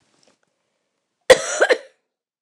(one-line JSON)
{"cough_length": "2.4 s", "cough_amplitude": 29204, "cough_signal_mean_std_ratio": 0.25, "survey_phase": "beta (2021-08-13 to 2022-03-07)", "age": "45-64", "gender": "Female", "wearing_mask": "No", "symptom_none": true, "smoker_status": "Never smoked", "respiratory_condition_asthma": false, "respiratory_condition_other": false, "recruitment_source": "REACT", "submission_delay": "1 day", "covid_test_result": "Negative", "covid_test_method": "RT-qPCR", "influenza_a_test_result": "Unknown/Void", "influenza_b_test_result": "Unknown/Void"}